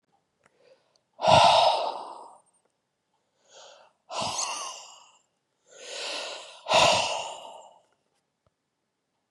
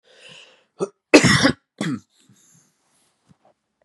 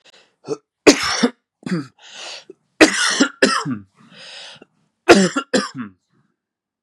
{
  "exhalation_length": "9.3 s",
  "exhalation_amplitude": 18736,
  "exhalation_signal_mean_std_ratio": 0.36,
  "cough_length": "3.8 s",
  "cough_amplitude": 32768,
  "cough_signal_mean_std_ratio": 0.28,
  "three_cough_length": "6.8 s",
  "three_cough_amplitude": 32768,
  "three_cough_signal_mean_std_ratio": 0.37,
  "survey_phase": "beta (2021-08-13 to 2022-03-07)",
  "age": "18-44",
  "gender": "Male",
  "wearing_mask": "No",
  "symptom_runny_or_blocked_nose": true,
  "symptom_diarrhoea": true,
  "symptom_fatigue": true,
  "symptom_onset": "6 days",
  "smoker_status": "Never smoked",
  "respiratory_condition_asthma": false,
  "respiratory_condition_other": false,
  "recruitment_source": "Test and Trace",
  "submission_delay": "2 days",
  "covid_test_result": "Positive",
  "covid_test_method": "RT-qPCR",
  "covid_ct_value": 19.6,
  "covid_ct_gene": "ORF1ab gene",
  "covid_ct_mean": 21.2,
  "covid_viral_load": "110000 copies/ml",
  "covid_viral_load_category": "Low viral load (10K-1M copies/ml)"
}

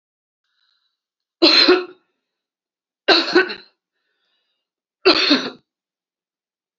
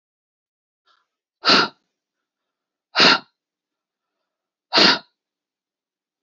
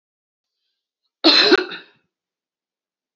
{
  "three_cough_length": "6.8 s",
  "three_cough_amplitude": 30498,
  "three_cough_signal_mean_std_ratio": 0.32,
  "exhalation_length": "6.2 s",
  "exhalation_amplitude": 31785,
  "exhalation_signal_mean_std_ratio": 0.26,
  "cough_length": "3.2 s",
  "cough_amplitude": 31674,
  "cough_signal_mean_std_ratio": 0.28,
  "survey_phase": "beta (2021-08-13 to 2022-03-07)",
  "age": "45-64",
  "gender": "Female",
  "wearing_mask": "No",
  "symptom_none": true,
  "smoker_status": "Never smoked",
  "respiratory_condition_asthma": false,
  "respiratory_condition_other": false,
  "recruitment_source": "REACT",
  "submission_delay": "2 days",
  "covid_test_result": "Negative",
  "covid_test_method": "RT-qPCR",
  "influenza_a_test_result": "Unknown/Void",
  "influenza_b_test_result": "Unknown/Void"
}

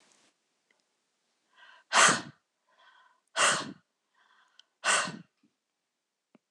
{
  "exhalation_length": "6.5 s",
  "exhalation_amplitude": 13310,
  "exhalation_signal_mean_std_ratio": 0.27,
  "survey_phase": "beta (2021-08-13 to 2022-03-07)",
  "age": "45-64",
  "gender": "Female",
  "wearing_mask": "No",
  "symptom_cough_any": true,
  "symptom_new_continuous_cough": true,
  "symptom_runny_or_blocked_nose": true,
  "symptom_sore_throat": true,
  "symptom_onset": "3 days",
  "smoker_status": "Never smoked",
  "respiratory_condition_asthma": false,
  "respiratory_condition_other": false,
  "recruitment_source": "Test and Trace",
  "submission_delay": "2 days",
  "covid_test_result": "Positive",
  "covid_test_method": "RT-qPCR",
  "covid_ct_value": 34.0,
  "covid_ct_gene": "ORF1ab gene"
}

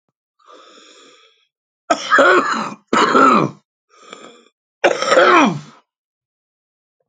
{
  "cough_length": "7.1 s",
  "cough_amplitude": 29942,
  "cough_signal_mean_std_ratio": 0.43,
  "survey_phase": "alpha (2021-03-01 to 2021-08-12)",
  "age": "45-64",
  "gender": "Male",
  "wearing_mask": "No",
  "symptom_shortness_of_breath": true,
  "smoker_status": "Ex-smoker",
  "respiratory_condition_asthma": true,
  "respiratory_condition_other": true,
  "recruitment_source": "REACT",
  "submission_delay": "2 days",
  "covid_test_result": "Negative",
  "covid_test_method": "RT-qPCR"
}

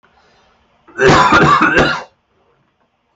{
  "cough_length": "3.2 s",
  "cough_amplitude": 32623,
  "cough_signal_mean_std_ratio": 0.5,
  "survey_phase": "alpha (2021-03-01 to 2021-08-12)",
  "age": "18-44",
  "gender": "Male",
  "wearing_mask": "No",
  "symptom_none": true,
  "smoker_status": "Ex-smoker",
  "respiratory_condition_asthma": false,
  "respiratory_condition_other": false,
  "recruitment_source": "REACT",
  "submission_delay": "2 days",
  "covid_test_result": "Negative",
  "covid_test_method": "RT-qPCR"
}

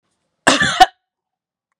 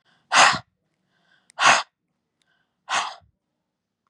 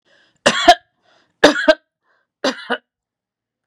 {
  "cough_length": "1.8 s",
  "cough_amplitude": 32768,
  "cough_signal_mean_std_ratio": 0.31,
  "exhalation_length": "4.1 s",
  "exhalation_amplitude": 25510,
  "exhalation_signal_mean_std_ratio": 0.3,
  "three_cough_length": "3.7 s",
  "three_cough_amplitude": 32768,
  "three_cough_signal_mean_std_ratio": 0.29,
  "survey_phase": "beta (2021-08-13 to 2022-03-07)",
  "age": "65+",
  "gender": "Female",
  "wearing_mask": "No",
  "symptom_none": true,
  "symptom_onset": "4 days",
  "smoker_status": "Ex-smoker",
  "respiratory_condition_asthma": false,
  "respiratory_condition_other": false,
  "recruitment_source": "REACT",
  "submission_delay": "2 days",
  "covid_test_result": "Negative",
  "covid_test_method": "RT-qPCR",
  "influenza_a_test_result": "Negative",
  "influenza_b_test_result": "Negative"
}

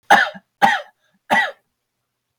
{
  "three_cough_length": "2.4 s",
  "three_cough_amplitude": 32768,
  "three_cough_signal_mean_std_ratio": 0.37,
  "survey_phase": "beta (2021-08-13 to 2022-03-07)",
  "age": "45-64",
  "gender": "Male",
  "wearing_mask": "No",
  "symptom_none": true,
  "smoker_status": "Never smoked",
  "respiratory_condition_asthma": false,
  "respiratory_condition_other": false,
  "recruitment_source": "REACT",
  "submission_delay": "1 day",
  "covid_test_result": "Negative",
  "covid_test_method": "RT-qPCR",
  "influenza_a_test_result": "Negative",
  "influenza_b_test_result": "Negative"
}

